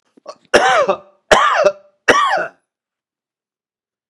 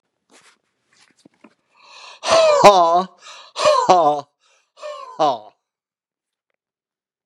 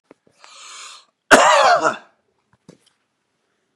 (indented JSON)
{
  "three_cough_length": "4.1 s",
  "three_cough_amplitude": 32768,
  "three_cough_signal_mean_std_ratio": 0.45,
  "exhalation_length": "7.3 s",
  "exhalation_amplitude": 32768,
  "exhalation_signal_mean_std_ratio": 0.38,
  "cough_length": "3.8 s",
  "cough_amplitude": 32768,
  "cough_signal_mean_std_ratio": 0.33,
  "survey_phase": "beta (2021-08-13 to 2022-03-07)",
  "age": "65+",
  "gender": "Male",
  "wearing_mask": "No",
  "symptom_none": true,
  "smoker_status": "Ex-smoker",
  "respiratory_condition_asthma": false,
  "respiratory_condition_other": false,
  "recruitment_source": "REACT",
  "submission_delay": "2 days",
  "covid_test_result": "Negative",
  "covid_test_method": "RT-qPCR",
  "influenza_a_test_result": "Negative",
  "influenza_b_test_result": "Negative"
}